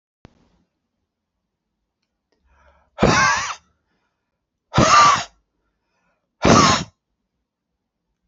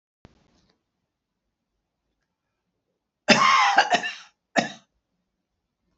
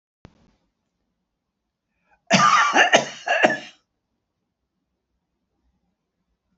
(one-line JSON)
{"exhalation_length": "8.3 s", "exhalation_amplitude": 31197, "exhalation_signal_mean_std_ratio": 0.32, "three_cough_length": "6.0 s", "three_cough_amplitude": 27677, "three_cough_signal_mean_std_ratio": 0.29, "cough_length": "6.6 s", "cough_amplitude": 32060, "cough_signal_mean_std_ratio": 0.31, "survey_phase": "beta (2021-08-13 to 2022-03-07)", "age": "65+", "gender": "Male", "wearing_mask": "No", "symptom_none": true, "smoker_status": "Never smoked", "respiratory_condition_asthma": false, "respiratory_condition_other": false, "recruitment_source": "REACT", "submission_delay": "2 days", "covid_test_result": "Negative", "covid_test_method": "RT-qPCR"}